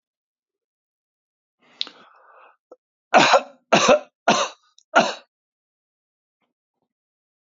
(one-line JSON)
{"three_cough_length": "7.4 s", "three_cough_amplitude": 26734, "three_cough_signal_mean_std_ratio": 0.27, "survey_phase": "beta (2021-08-13 to 2022-03-07)", "age": "65+", "gender": "Male", "wearing_mask": "No", "symptom_none": true, "smoker_status": "Ex-smoker", "respiratory_condition_asthma": false, "respiratory_condition_other": false, "recruitment_source": "REACT", "submission_delay": "1 day", "covid_test_result": "Negative", "covid_test_method": "RT-qPCR", "influenza_a_test_result": "Negative", "influenza_b_test_result": "Negative"}